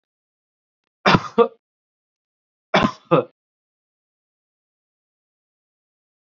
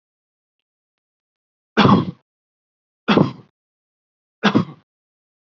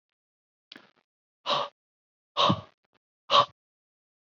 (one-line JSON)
{"cough_length": "6.2 s", "cough_amplitude": 27797, "cough_signal_mean_std_ratio": 0.21, "three_cough_length": "5.5 s", "three_cough_amplitude": 29538, "three_cough_signal_mean_std_ratio": 0.27, "exhalation_length": "4.3 s", "exhalation_amplitude": 13591, "exhalation_signal_mean_std_ratio": 0.27, "survey_phase": "beta (2021-08-13 to 2022-03-07)", "age": "18-44", "gender": "Male", "wearing_mask": "No", "symptom_none": true, "smoker_status": "Never smoked", "respiratory_condition_asthma": false, "respiratory_condition_other": false, "recruitment_source": "REACT", "submission_delay": "1 day", "covid_test_result": "Negative", "covid_test_method": "RT-qPCR", "influenza_a_test_result": "Negative", "influenza_b_test_result": "Negative"}